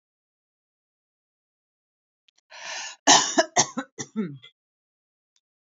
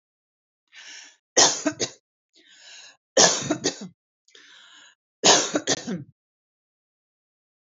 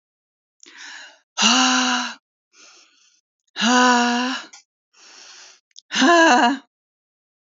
{"cough_length": "5.7 s", "cough_amplitude": 24301, "cough_signal_mean_std_ratio": 0.25, "three_cough_length": "7.8 s", "three_cough_amplitude": 24605, "three_cough_signal_mean_std_ratio": 0.31, "exhalation_length": "7.4 s", "exhalation_amplitude": 26422, "exhalation_signal_mean_std_ratio": 0.46, "survey_phase": "alpha (2021-03-01 to 2021-08-12)", "age": "45-64", "gender": "Female", "wearing_mask": "No", "symptom_none": true, "smoker_status": "Never smoked", "respiratory_condition_asthma": false, "respiratory_condition_other": false, "recruitment_source": "REACT", "submission_delay": "1 day", "covid_test_result": "Negative", "covid_test_method": "RT-qPCR"}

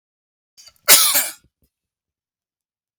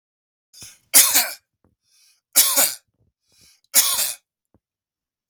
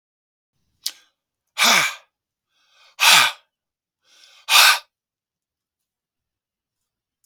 {"cough_length": "3.0 s", "cough_amplitude": 32768, "cough_signal_mean_std_ratio": 0.27, "three_cough_length": "5.3 s", "three_cough_amplitude": 32768, "three_cough_signal_mean_std_ratio": 0.33, "exhalation_length": "7.3 s", "exhalation_amplitude": 32766, "exhalation_signal_mean_std_ratio": 0.28, "survey_phase": "beta (2021-08-13 to 2022-03-07)", "age": "65+", "gender": "Male", "wearing_mask": "No", "symptom_none": true, "smoker_status": "Never smoked", "respiratory_condition_asthma": true, "respiratory_condition_other": false, "recruitment_source": "REACT", "submission_delay": "1 day", "covid_test_result": "Negative", "covid_test_method": "RT-qPCR", "influenza_a_test_result": "Negative", "influenza_b_test_result": "Negative"}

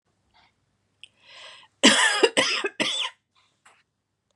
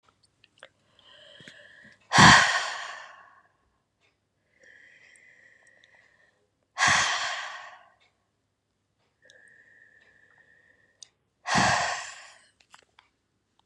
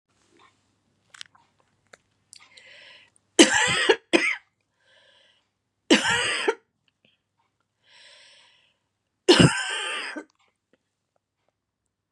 {"cough_length": "4.4 s", "cough_amplitude": 26297, "cough_signal_mean_std_ratio": 0.36, "exhalation_length": "13.7 s", "exhalation_amplitude": 29280, "exhalation_signal_mean_std_ratio": 0.26, "three_cough_length": "12.1 s", "three_cough_amplitude": 31664, "three_cough_signal_mean_std_ratio": 0.29, "survey_phase": "beta (2021-08-13 to 2022-03-07)", "age": "45-64", "gender": "Female", "wearing_mask": "No", "symptom_none": true, "symptom_onset": "4 days", "smoker_status": "Ex-smoker", "respiratory_condition_asthma": false, "respiratory_condition_other": false, "recruitment_source": "REACT", "submission_delay": "1 day", "covid_test_result": "Negative", "covid_test_method": "RT-qPCR", "influenza_a_test_result": "Negative", "influenza_b_test_result": "Negative"}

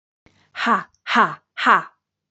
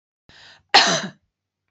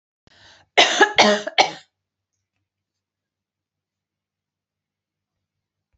{"exhalation_length": "2.3 s", "exhalation_amplitude": 31204, "exhalation_signal_mean_std_ratio": 0.41, "cough_length": "1.7 s", "cough_amplitude": 31894, "cough_signal_mean_std_ratio": 0.31, "three_cough_length": "6.0 s", "three_cough_amplitude": 29540, "three_cough_signal_mean_std_ratio": 0.25, "survey_phase": "beta (2021-08-13 to 2022-03-07)", "age": "45-64", "gender": "Female", "wearing_mask": "No", "symptom_none": true, "smoker_status": "Ex-smoker", "respiratory_condition_asthma": false, "respiratory_condition_other": false, "recruitment_source": "REACT", "submission_delay": "2 days", "covid_test_result": "Negative", "covid_test_method": "RT-qPCR", "influenza_a_test_result": "Unknown/Void", "influenza_b_test_result": "Unknown/Void"}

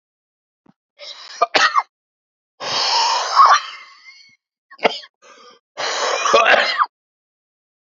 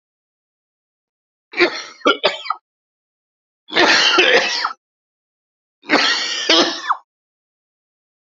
{"exhalation_length": "7.9 s", "exhalation_amplitude": 32767, "exhalation_signal_mean_std_ratio": 0.44, "three_cough_length": "8.4 s", "three_cough_amplitude": 31087, "three_cough_signal_mean_std_ratio": 0.42, "survey_phase": "alpha (2021-03-01 to 2021-08-12)", "age": "45-64", "gender": "Male", "wearing_mask": "No", "symptom_cough_any": true, "symptom_diarrhoea": true, "symptom_fatigue": true, "symptom_change_to_sense_of_smell_or_taste": true, "symptom_onset": "3 days", "smoker_status": "Ex-smoker", "respiratory_condition_asthma": false, "respiratory_condition_other": false, "recruitment_source": "Test and Trace", "submission_delay": "2 days", "covid_test_result": "Positive", "covid_test_method": "RT-qPCR", "covid_ct_value": 21.1, "covid_ct_gene": "ORF1ab gene", "covid_ct_mean": 21.7, "covid_viral_load": "75000 copies/ml", "covid_viral_load_category": "Low viral load (10K-1M copies/ml)"}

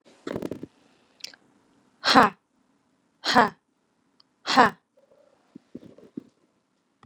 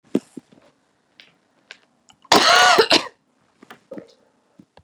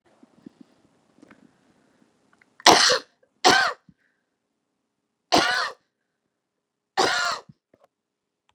{"exhalation_length": "7.1 s", "exhalation_amplitude": 30024, "exhalation_signal_mean_std_ratio": 0.23, "cough_length": "4.8 s", "cough_amplitude": 32768, "cough_signal_mean_std_ratio": 0.3, "three_cough_length": "8.5 s", "three_cough_amplitude": 32768, "three_cough_signal_mean_std_ratio": 0.28, "survey_phase": "beta (2021-08-13 to 2022-03-07)", "age": "45-64", "gender": "Female", "wearing_mask": "No", "symptom_sore_throat": true, "symptom_headache": true, "symptom_onset": "8 days", "smoker_status": "Ex-smoker", "respiratory_condition_asthma": false, "respiratory_condition_other": false, "recruitment_source": "REACT", "submission_delay": "0 days", "covid_test_result": "Negative", "covid_test_method": "RT-qPCR"}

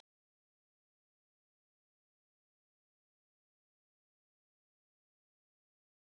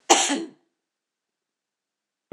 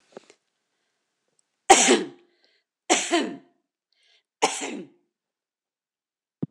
{"exhalation_length": "6.1 s", "exhalation_amplitude": 96, "exhalation_signal_mean_std_ratio": 0.02, "cough_length": "2.3 s", "cough_amplitude": 26027, "cough_signal_mean_std_ratio": 0.27, "three_cough_length": "6.5 s", "three_cough_amplitude": 26028, "three_cough_signal_mean_std_ratio": 0.27, "survey_phase": "beta (2021-08-13 to 2022-03-07)", "age": "65+", "gender": "Female", "wearing_mask": "No", "symptom_none": true, "smoker_status": "Ex-smoker", "respiratory_condition_asthma": false, "respiratory_condition_other": false, "recruitment_source": "REACT", "submission_delay": "20 days", "covid_test_result": "Negative", "covid_test_method": "RT-qPCR", "influenza_a_test_result": "Negative", "influenza_b_test_result": "Negative"}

